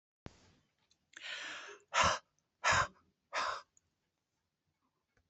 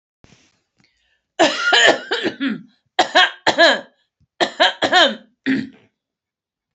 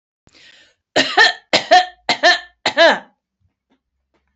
exhalation_length: 5.3 s
exhalation_amplitude: 4698
exhalation_signal_mean_std_ratio: 0.33
three_cough_length: 6.7 s
three_cough_amplitude: 32767
three_cough_signal_mean_std_ratio: 0.44
cough_length: 4.4 s
cough_amplitude: 30284
cough_signal_mean_std_ratio: 0.39
survey_phase: beta (2021-08-13 to 2022-03-07)
age: 65+
gender: Female
wearing_mask: 'No'
symptom_none: true
symptom_onset: 11 days
smoker_status: Never smoked
respiratory_condition_asthma: false
respiratory_condition_other: false
recruitment_source: REACT
submission_delay: 17 days
covid_test_result: Negative
covid_test_method: RT-qPCR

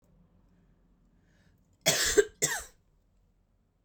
cough_length: 3.8 s
cough_amplitude: 12126
cough_signal_mean_std_ratio: 0.28
survey_phase: beta (2021-08-13 to 2022-03-07)
age: 18-44
gender: Female
wearing_mask: 'No'
symptom_cough_any: true
symptom_new_continuous_cough: true
symptom_runny_or_blocked_nose: true
symptom_shortness_of_breath: true
symptom_sore_throat: true
symptom_fatigue: true
symptom_headache: true
symptom_change_to_sense_of_smell_or_taste: true
symptom_onset: 3 days
smoker_status: Ex-smoker
respiratory_condition_asthma: false
respiratory_condition_other: false
recruitment_source: Test and Trace
submission_delay: 1 day
covid_test_result: Positive
covid_test_method: RT-qPCR
covid_ct_value: 23.4
covid_ct_gene: ORF1ab gene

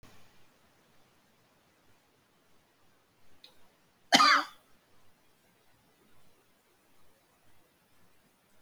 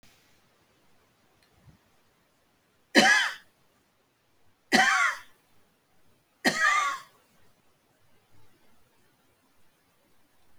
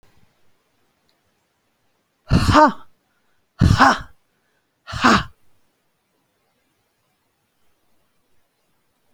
cough_length: 8.6 s
cough_amplitude: 17470
cough_signal_mean_std_ratio: 0.19
three_cough_length: 10.6 s
three_cough_amplitude: 23662
three_cough_signal_mean_std_ratio: 0.29
exhalation_length: 9.1 s
exhalation_amplitude: 32767
exhalation_signal_mean_std_ratio: 0.26
survey_phase: beta (2021-08-13 to 2022-03-07)
age: 65+
gender: Female
wearing_mask: 'No'
symptom_cough_any: true
symptom_shortness_of_breath: true
smoker_status: Ex-smoker
respiratory_condition_asthma: false
respiratory_condition_other: false
recruitment_source: REACT
submission_delay: 1 day
covid_test_result: Negative
covid_test_method: RT-qPCR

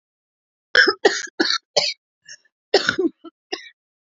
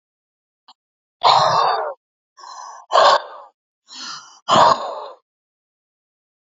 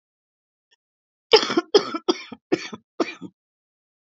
cough_length: 4.1 s
cough_amplitude: 28838
cough_signal_mean_std_ratio: 0.36
exhalation_length: 6.6 s
exhalation_amplitude: 28966
exhalation_signal_mean_std_ratio: 0.38
three_cough_length: 4.1 s
three_cough_amplitude: 29128
three_cough_signal_mean_std_ratio: 0.27
survey_phase: alpha (2021-03-01 to 2021-08-12)
age: 45-64
gender: Female
wearing_mask: 'No'
symptom_none: true
smoker_status: Current smoker (1 to 10 cigarettes per day)
respiratory_condition_asthma: true
respiratory_condition_other: false
recruitment_source: REACT
submission_delay: 1 day
covid_test_result: Negative
covid_test_method: RT-qPCR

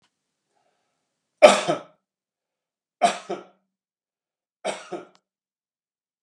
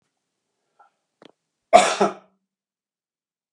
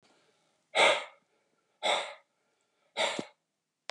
three_cough_length: 6.2 s
three_cough_amplitude: 32768
three_cough_signal_mean_std_ratio: 0.19
cough_length: 3.5 s
cough_amplitude: 32768
cough_signal_mean_std_ratio: 0.21
exhalation_length: 3.9 s
exhalation_amplitude: 9570
exhalation_signal_mean_std_ratio: 0.33
survey_phase: beta (2021-08-13 to 2022-03-07)
age: 45-64
gender: Male
wearing_mask: 'No'
symptom_none: true
smoker_status: Ex-smoker
respiratory_condition_asthma: false
respiratory_condition_other: false
recruitment_source: REACT
submission_delay: 3 days
covid_test_result: Negative
covid_test_method: RT-qPCR
influenza_a_test_result: Unknown/Void
influenza_b_test_result: Unknown/Void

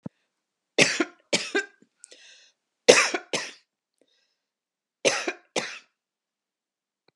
three_cough_length: 7.2 s
three_cough_amplitude: 32720
three_cough_signal_mean_std_ratio: 0.27
survey_phase: beta (2021-08-13 to 2022-03-07)
age: 65+
gender: Female
wearing_mask: 'No'
symptom_none: true
smoker_status: Never smoked
respiratory_condition_asthma: false
respiratory_condition_other: false
recruitment_source: REACT
submission_delay: 1 day
covid_test_result: Negative
covid_test_method: RT-qPCR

